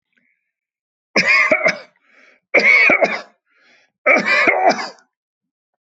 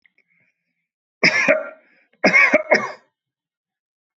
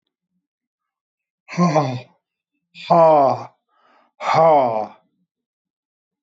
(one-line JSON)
{"three_cough_length": "5.8 s", "three_cough_amplitude": 26014, "three_cough_signal_mean_std_ratio": 0.49, "cough_length": "4.2 s", "cough_amplitude": 26857, "cough_signal_mean_std_ratio": 0.37, "exhalation_length": "6.2 s", "exhalation_amplitude": 24706, "exhalation_signal_mean_std_ratio": 0.4, "survey_phase": "alpha (2021-03-01 to 2021-08-12)", "age": "65+", "gender": "Male", "wearing_mask": "No", "symptom_none": true, "smoker_status": "Never smoked", "respiratory_condition_asthma": false, "respiratory_condition_other": false, "recruitment_source": "REACT", "submission_delay": "1 day", "covid_test_result": "Negative", "covid_test_method": "RT-qPCR"}